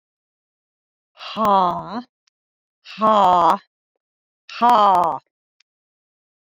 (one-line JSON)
{"exhalation_length": "6.5 s", "exhalation_amplitude": 24422, "exhalation_signal_mean_std_ratio": 0.38, "survey_phase": "beta (2021-08-13 to 2022-03-07)", "age": "65+", "gender": "Female", "wearing_mask": "No", "symptom_cough_any": true, "symptom_runny_or_blocked_nose": true, "symptom_headache": true, "symptom_other": true, "smoker_status": "Never smoked", "respiratory_condition_asthma": false, "respiratory_condition_other": false, "recruitment_source": "Test and Trace", "submission_delay": "2 days", "covid_test_result": "Positive", "covid_test_method": "RT-qPCR", "covid_ct_value": 13.6, "covid_ct_gene": "ORF1ab gene", "covid_ct_mean": 14.0, "covid_viral_load": "25000000 copies/ml", "covid_viral_load_category": "High viral load (>1M copies/ml)"}